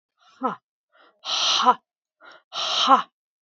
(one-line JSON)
{"exhalation_length": "3.4 s", "exhalation_amplitude": 25047, "exhalation_signal_mean_std_ratio": 0.41, "survey_phase": "beta (2021-08-13 to 2022-03-07)", "age": "45-64", "gender": "Female", "wearing_mask": "No", "symptom_none": true, "smoker_status": "Never smoked", "respiratory_condition_asthma": false, "respiratory_condition_other": false, "recruitment_source": "REACT", "submission_delay": "3 days", "covid_test_result": "Negative", "covid_test_method": "RT-qPCR"}